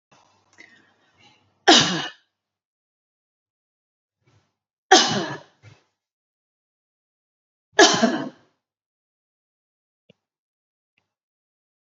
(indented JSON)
{
  "three_cough_length": "11.9 s",
  "three_cough_amplitude": 29597,
  "three_cough_signal_mean_std_ratio": 0.22,
  "survey_phase": "beta (2021-08-13 to 2022-03-07)",
  "age": "45-64",
  "gender": "Female",
  "wearing_mask": "No",
  "symptom_none": true,
  "smoker_status": "Ex-smoker",
  "respiratory_condition_asthma": false,
  "respiratory_condition_other": false,
  "recruitment_source": "REACT",
  "submission_delay": "5 days",
  "covid_test_result": "Negative",
  "covid_test_method": "RT-qPCR",
  "influenza_a_test_result": "Negative",
  "influenza_b_test_result": "Negative"
}